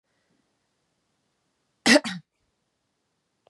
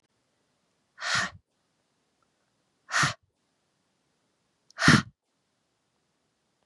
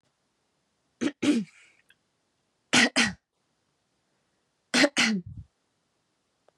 {"cough_length": "3.5 s", "cough_amplitude": 24503, "cough_signal_mean_std_ratio": 0.18, "exhalation_length": "6.7 s", "exhalation_amplitude": 18237, "exhalation_signal_mean_std_ratio": 0.23, "three_cough_length": "6.6 s", "three_cough_amplitude": 14704, "three_cough_signal_mean_std_ratio": 0.31, "survey_phase": "beta (2021-08-13 to 2022-03-07)", "age": "18-44", "gender": "Female", "wearing_mask": "No", "symptom_runny_or_blocked_nose": true, "symptom_shortness_of_breath": true, "symptom_headache": true, "symptom_onset": "4 days", "smoker_status": "Never smoked", "respiratory_condition_asthma": false, "respiratory_condition_other": false, "recruitment_source": "Test and Trace", "submission_delay": "3 days", "covid_test_result": "Positive", "covid_test_method": "RT-qPCR", "covid_ct_value": 14.4, "covid_ct_gene": "ORF1ab gene"}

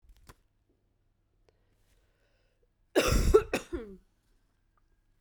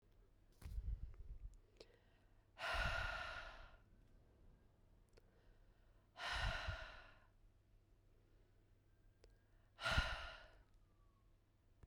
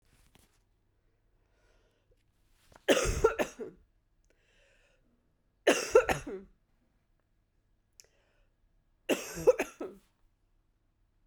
{"cough_length": "5.2 s", "cough_amplitude": 13370, "cough_signal_mean_std_ratio": 0.27, "exhalation_length": "11.9 s", "exhalation_amplitude": 1707, "exhalation_signal_mean_std_ratio": 0.45, "three_cough_length": "11.3 s", "three_cough_amplitude": 12215, "three_cough_signal_mean_std_ratio": 0.25, "survey_phase": "beta (2021-08-13 to 2022-03-07)", "age": "18-44", "gender": "Female", "wearing_mask": "No", "symptom_cough_any": true, "symptom_runny_or_blocked_nose": true, "symptom_abdominal_pain": true, "symptom_diarrhoea": true, "symptom_fatigue": true, "symptom_fever_high_temperature": true, "symptom_headache": true, "symptom_change_to_sense_of_smell_or_taste": true, "symptom_loss_of_taste": true, "symptom_onset": "3 days", "smoker_status": "Never smoked", "respiratory_condition_asthma": false, "respiratory_condition_other": false, "recruitment_source": "Test and Trace", "submission_delay": "2 days", "covid_test_result": "Positive", "covid_test_method": "RT-qPCR", "covid_ct_value": 22.7, "covid_ct_gene": "ORF1ab gene"}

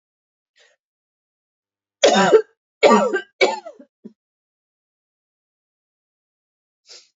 {"three_cough_length": "7.2 s", "three_cough_amplitude": 29579, "three_cough_signal_mean_std_ratio": 0.28, "survey_phase": "beta (2021-08-13 to 2022-03-07)", "age": "18-44", "gender": "Female", "wearing_mask": "No", "symptom_cough_any": true, "symptom_runny_or_blocked_nose": true, "symptom_sore_throat": true, "symptom_fatigue": true, "symptom_headache": true, "symptom_change_to_sense_of_smell_or_taste": true, "symptom_loss_of_taste": true, "symptom_onset": "2 days", "smoker_status": "Ex-smoker", "respiratory_condition_asthma": true, "respiratory_condition_other": false, "recruitment_source": "Test and Trace", "submission_delay": "2 days", "covid_test_result": "Positive", "covid_test_method": "RT-qPCR"}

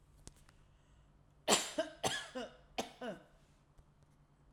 {"three_cough_length": "4.5 s", "three_cough_amplitude": 7280, "three_cough_signal_mean_std_ratio": 0.35, "survey_phase": "alpha (2021-03-01 to 2021-08-12)", "age": "65+", "gender": "Female", "wearing_mask": "No", "symptom_none": true, "smoker_status": "Never smoked", "respiratory_condition_asthma": false, "respiratory_condition_other": false, "recruitment_source": "REACT", "submission_delay": "1 day", "covid_test_result": "Negative", "covid_test_method": "RT-qPCR"}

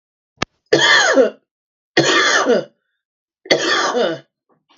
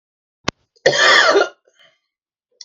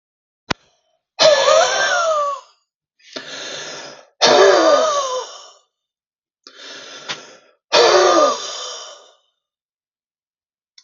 {"three_cough_length": "4.8 s", "three_cough_amplitude": 32768, "three_cough_signal_mean_std_ratio": 0.54, "cough_length": "2.6 s", "cough_amplitude": 32768, "cough_signal_mean_std_ratio": 0.4, "exhalation_length": "10.8 s", "exhalation_amplitude": 32768, "exhalation_signal_mean_std_ratio": 0.46, "survey_phase": "beta (2021-08-13 to 2022-03-07)", "age": "45-64", "gender": "Male", "wearing_mask": "No", "symptom_none": true, "symptom_onset": "3 days", "smoker_status": "Ex-smoker", "respiratory_condition_asthma": false, "respiratory_condition_other": false, "recruitment_source": "REACT", "submission_delay": "2 days", "covid_test_result": "Negative", "covid_test_method": "RT-qPCR", "influenza_a_test_result": "Negative", "influenza_b_test_result": "Negative"}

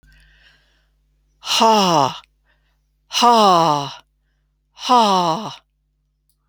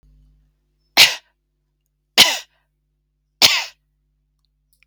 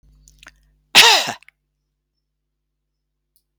{"exhalation_length": "6.5 s", "exhalation_amplitude": 29442, "exhalation_signal_mean_std_ratio": 0.43, "three_cough_length": "4.9 s", "three_cough_amplitude": 32768, "three_cough_signal_mean_std_ratio": 0.24, "cough_length": "3.6 s", "cough_amplitude": 32767, "cough_signal_mean_std_ratio": 0.23, "survey_phase": "alpha (2021-03-01 to 2021-08-12)", "age": "65+", "gender": "Female", "wearing_mask": "No", "symptom_none": true, "smoker_status": "Never smoked", "respiratory_condition_asthma": false, "respiratory_condition_other": false, "recruitment_source": "REACT", "submission_delay": "3 days", "covid_test_result": "Negative", "covid_test_method": "RT-qPCR"}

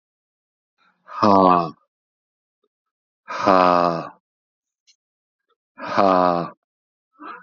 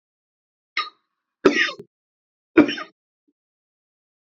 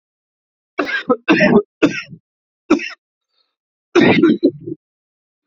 {"exhalation_length": "7.4 s", "exhalation_amplitude": 27969, "exhalation_signal_mean_std_ratio": 0.34, "three_cough_length": "4.4 s", "three_cough_amplitude": 32767, "three_cough_signal_mean_std_ratio": 0.23, "cough_length": "5.5 s", "cough_amplitude": 31202, "cough_signal_mean_std_ratio": 0.41, "survey_phase": "beta (2021-08-13 to 2022-03-07)", "age": "18-44", "gender": "Male", "wearing_mask": "No", "symptom_cough_any": true, "symptom_new_continuous_cough": true, "symptom_runny_or_blocked_nose": true, "symptom_sore_throat": true, "symptom_fever_high_temperature": true, "symptom_onset": "2 days", "smoker_status": "Never smoked", "respiratory_condition_asthma": false, "respiratory_condition_other": false, "recruitment_source": "Test and Trace", "submission_delay": "1 day", "covid_test_result": "Positive", "covid_test_method": "ePCR"}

